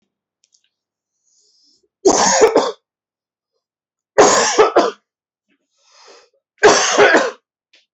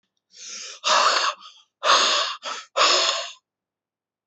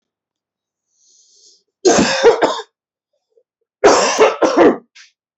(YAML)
three_cough_length: 7.9 s
three_cough_amplitude: 32767
three_cough_signal_mean_std_ratio: 0.4
exhalation_length: 4.3 s
exhalation_amplitude: 19886
exhalation_signal_mean_std_ratio: 0.54
cough_length: 5.4 s
cough_amplitude: 31584
cough_signal_mean_std_ratio: 0.43
survey_phase: alpha (2021-03-01 to 2021-08-12)
age: 18-44
gender: Male
wearing_mask: 'No'
symptom_none: true
smoker_status: Never smoked
respiratory_condition_asthma: true
respiratory_condition_other: false
recruitment_source: REACT
submission_delay: 3 days
covid_test_result: Negative
covid_test_method: RT-qPCR